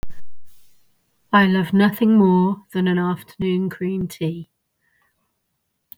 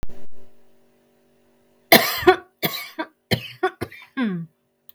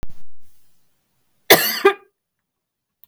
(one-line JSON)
{"exhalation_length": "6.0 s", "exhalation_amplitude": 22084, "exhalation_signal_mean_std_ratio": 0.63, "three_cough_length": "4.9 s", "three_cough_amplitude": 32768, "three_cough_signal_mean_std_ratio": 0.41, "cough_length": "3.1 s", "cough_amplitude": 32768, "cough_signal_mean_std_ratio": 0.38, "survey_phase": "beta (2021-08-13 to 2022-03-07)", "age": "45-64", "gender": "Female", "wearing_mask": "No", "symptom_cough_any": true, "symptom_runny_or_blocked_nose": true, "symptom_change_to_sense_of_smell_or_taste": true, "symptom_other": true, "smoker_status": "Ex-smoker", "respiratory_condition_asthma": false, "respiratory_condition_other": false, "recruitment_source": "Test and Trace", "submission_delay": "1 day", "covid_test_result": "Positive", "covid_test_method": "RT-qPCR", "covid_ct_value": 18.3, "covid_ct_gene": "ORF1ab gene", "covid_ct_mean": 18.9, "covid_viral_load": "620000 copies/ml", "covid_viral_load_category": "Low viral load (10K-1M copies/ml)"}